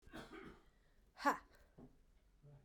{"exhalation_length": "2.6 s", "exhalation_amplitude": 2883, "exhalation_signal_mean_std_ratio": 0.29, "survey_phase": "beta (2021-08-13 to 2022-03-07)", "age": "45-64", "gender": "Female", "wearing_mask": "No", "symptom_cough_any": true, "symptom_runny_or_blocked_nose": true, "symptom_fatigue": true, "symptom_headache": true, "symptom_onset": "4 days", "smoker_status": "Never smoked", "respiratory_condition_asthma": false, "respiratory_condition_other": false, "recruitment_source": "Test and Trace", "submission_delay": "2 days", "covid_test_result": "Positive", "covid_test_method": "RT-qPCR", "covid_ct_value": 23.1, "covid_ct_gene": "ORF1ab gene", "covid_ct_mean": 23.6, "covid_viral_load": "18000 copies/ml", "covid_viral_load_category": "Low viral load (10K-1M copies/ml)"}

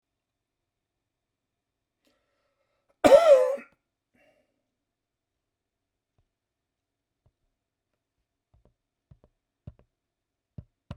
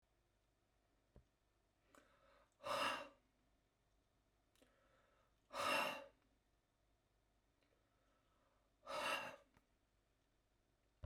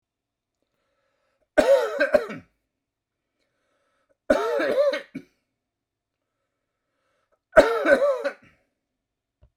{"cough_length": "11.0 s", "cough_amplitude": 20714, "cough_signal_mean_std_ratio": 0.17, "exhalation_length": "11.1 s", "exhalation_amplitude": 1145, "exhalation_signal_mean_std_ratio": 0.3, "three_cough_length": "9.6 s", "three_cough_amplitude": 27392, "three_cough_signal_mean_std_ratio": 0.34, "survey_phase": "beta (2021-08-13 to 2022-03-07)", "age": "65+", "gender": "Male", "wearing_mask": "No", "symptom_none": true, "smoker_status": "Ex-smoker", "respiratory_condition_asthma": false, "respiratory_condition_other": false, "recruitment_source": "REACT", "submission_delay": "3 days", "covid_test_result": "Negative", "covid_test_method": "RT-qPCR", "covid_ct_value": 42.0, "covid_ct_gene": "N gene"}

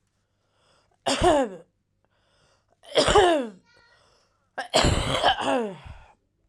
{"three_cough_length": "6.5 s", "three_cough_amplitude": 18961, "three_cough_signal_mean_std_ratio": 0.44, "survey_phase": "alpha (2021-03-01 to 2021-08-12)", "age": "18-44", "gender": "Female", "wearing_mask": "No", "symptom_cough_any": true, "symptom_shortness_of_breath": true, "symptom_abdominal_pain": true, "symptom_fever_high_temperature": true, "symptom_headache": true, "symptom_change_to_sense_of_smell_or_taste": true, "symptom_loss_of_taste": true, "symptom_onset": "3 days", "smoker_status": "Current smoker (11 or more cigarettes per day)", "respiratory_condition_asthma": false, "respiratory_condition_other": false, "recruitment_source": "Test and Trace", "submission_delay": "1 day", "covid_test_result": "Positive", "covid_test_method": "RT-qPCR"}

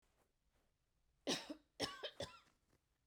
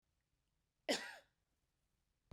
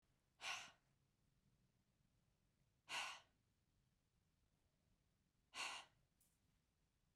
{"three_cough_length": "3.1 s", "three_cough_amplitude": 1622, "three_cough_signal_mean_std_ratio": 0.34, "cough_length": "2.3 s", "cough_amplitude": 1784, "cough_signal_mean_std_ratio": 0.22, "exhalation_length": "7.2 s", "exhalation_amplitude": 502, "exhalation_signal_mean_std_ratio": 0.31, "survey_phase": "beta (2021-08-13 to 2022-03-07)", "age": "45-64", "gender": "Female", "wearing_mask": "No", "symptom_none": true, "smoker_status": "Never smoked", "respiratory_condition_asthma": true, "respiratory_condition_other": false, "recruitment_source": "REACT", "submission_delay": "1 day", "covid_test_result": "Negative", "covid_test_method": "RT-qPCR", "influenza_a_test_result": "Negative", "influenza_b_test_result": "Negative"}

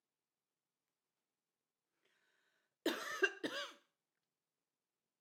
{"cough_length": "5.2 s", "cough_amplitude": 2904, "cough_signal_mean_std_ratio": 0.24, "survey_phase": "beta (2021-08-13 to 2022-03-07)", "age": "65+", "gender": "Female", "wearing_mask": "No", "symptom_none": true, "smoker_status": "Ex-smoker", "respiratory_condition_asthma": false, "respiratory_condition_other": false, "recruitment_source": "REACT", "submission_delay": "1 day", "covid_test_result": "Negative", "covid_test_method": "RT-qPCR", "influenza_a_test_result": "Negative", "influenza_b_test_result": "Negative"}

